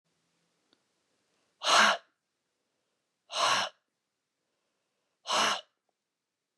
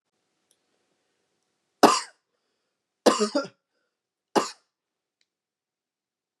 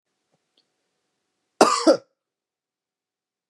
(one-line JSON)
{"exhalation_length": "6.6 s", "exhalation_amplitude": 10275, "exhalation_signal_mean_std_ratio": 0.3, "three_cough_length": "6.4 s", "three_cough_amplitude": 29005, "three_cough_signal_mean_std_ratio": 0.2, "cough_length": "3.5 s", "cough_amplitude": 30669, "cough_signal_mean_std_ratio": 0.21, "survey_phase": "beta (2021-08-13 to 2022-03-07)", "age": "18-44", "gender": "Male", "wearing_mask": "No", "symptom_none": true, "smoker_status": "Never smoked", "respiratory_condition_asthma": false, "respiratory_condition_other": false, "recruitment_source": "REACT", "submission_delay": "3 days", "covid_test_result": "Negative", "covid_test_method": "RT-qPCR", "influenza_a_test_result": "Negative", "influenza_b_test_result": "Negative"}